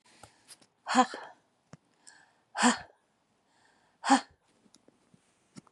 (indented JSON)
{
  "exhalation_length": "5.7 s",
  "exhalation_amplitude": 12002,
  "exhalation_signal_mean_std_ratio": 0.24,
  "survey_phase": "beta (2021-08-13 to 2022-03-07)",
  "age": "45-64",
  "gender": "Female",
  "wearing_mask": "No",
  "symptom_none": true,
  "smoker_status": "Never smoked",
  "respiratory_condition_asthma": false,
  "respiratory_condition_other": false,
  "recruitment_source": "REACT",
  "submission_delay": "2 days",
  "covid_test_result": "Negative",
  "covid_test_method": "RT-qPCR",
  "influenza_a_test_result": "Negative",
  "influenza_b_test_result": "Negative"
}